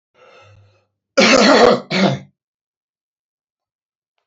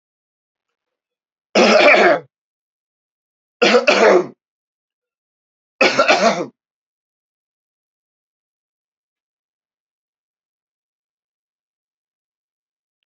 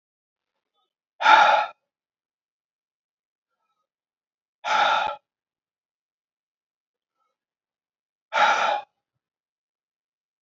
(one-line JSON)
{"cough_length": "4.3 s", "cough_amplitude": 30717, "cough_signal_mean_std_ratio": 0.37, "three_cough_length": "13.1 s", "three_cough_amplitude": 32767, "three_cough_signal_mean_std_ratio": 0.3, "exhalation_length": "10.4 s", "exhalation_amplitude": 27981, "exhalation_signal_mean_std_ratio": 0.27, "survey_phase": "beta (2021-08-13 to 2022-03-07)", "age": "65+", "gender": "Male", "wearing_mask": "No", "symptom_cough_any": true, "symptom_runny_or_blocked_nose": true, "smoker_status": "Ex-smoker", "respiratory_condition_asthma": false, "respiratory_condition_other": false, "recruitment_source": "REACT", "submission_delay": "2 days", "covid_test_result": "Negative", "covid_test_method": "RT-qPCR", "influenza_a_test_result": "Negative", "influenza_b_test_result": "Negative"}